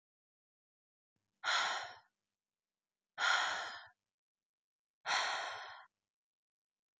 {
  "exhalation_length": "7.0 s",
  "exhalation_amplitude": 3356,
  "exhalation_signal_mean_std_ratio": 0.38,
  "survey_phase": "beta (2021-08-13 to 2022-03-07)",
  "age": "18-44",
  "gender": "Female",
  "wearing_mask": "No",
  "symptom_cough_any": true,
  "symptom_new_continuous_cough": true,
  "symptom_runny_or_blocked_nose": true,
  "symptom_sore_throat": true,
  "symptom_fatigue": true,
  "symptom_onset": "4 days",
  "smoker_status": "Never smoked",
  "respiratory_condition_asthma": false,
  "respiratory_condition_other": false,
  "recruitment_source": "Test and Trace",
  "submission_delay": "2 days",
  "covid_test_result": "Positive",
  "covid_test_method": "RT-qPCR",
  "covid_ct_value": 34.0,
  "covid_ct_gene": "N gene"
}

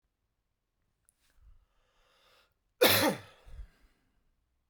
{
  "cough_length": "4.7 s",
  "cough_amplitude": 12186,
  "cough_signal_mean_std_ratio": 0.23,
  "survey_phase": "beta (2021-08-13 to 2022-03-07)",
  "age": "18-44",
  "gender": "Male",
  "wearing_mask": "No",
  "symptom_none": true,
  "smoker_status": "Ex-smoker",
  "respiratory_condition_asthma": false,
  "respiratory_condition_other": false,
  "recruitment_source": "REACT",
  "submission_delay": "1 day",
  "covid_test_result": "Negative",
  "covid_test_method": "RT-qPCR"
}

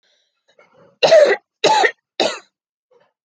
{
  "three_cough_length": "3.2 s",
  "three_cough_amplitude": 29779,
  "three_cough_signal_mean_std_ratio": 0.39,
  "survey_phase": "alpha (2021-03-01 to 2021-08-12)",
  "age": "18-44",
  "gender": "Female",
  "wearing_mask": "No",
  "symptom_none": true,
  "symptom_onset": "12 days",
  "smoker_status": "Never smoked",
  "respiratory_condition_asthma": false,
  "respiratory_condition_other": false,
  "recruitment_source": "REACT",
  "submission_delay": "1 day",
  "covid_test_result": "Negative",
  "covid_test_method": "RT-qPCR"
}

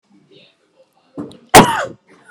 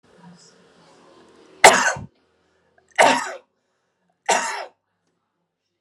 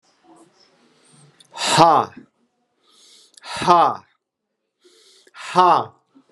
{
  "cough_length": "2.3 s",
  "cough_amplitude": 32768,
  "cough_signal_mean_std_ratio": 0.27,
  "three_cough_length": "5.8 s",
  "three_cough_amplitude": 32768,
  "three_cough_signal_mean_std_ratio": 0.27,
  "exhalation_length": "6.3 s",
  "exhalation_amplitude": 32768,
  "exhalation_signal_mean_std_ratio": 0.33,
  "survey_phase": "alpha (2021-03-01 to 2021-08-12)",
  "age": "45-64",
  "gender": "Male",
  "wearing_mask": "No",
  "symptom_none": true,
  "smoker_status": "Ex-smoker",
  "respiratory_condition_asthma": false,
  "respiratory_condition_other": false,
  "recruitment_source": "REACT",
  "submission_delay": "1 day",
  "covid_test_result": "Negative",
  "covid_test_method": "RT-qPCR"
}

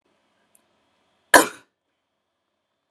{
  "cough_length": "2.9 s",
  "cough_amplitude": 32768,
  "cough_signal_mean_std_ratio": 0.14,
  "survey_phase": "alpha (2021-03-01 to 2021-08-12)",
  "age": "18-44",
  "gender": "Female",
  "wearing_mask": "No",
  "symptom_none": true,
  "smoker_status": "Ex-smoker",
  "respiratory_condition_asthma": true,
  "respiratory_condition_other": false,
  "recruitment_source": "REACT",
  "submission_delay": "1 day",
  "covid_test_result": "Negative",
  "covid_test_method": "RT-qPCR"
}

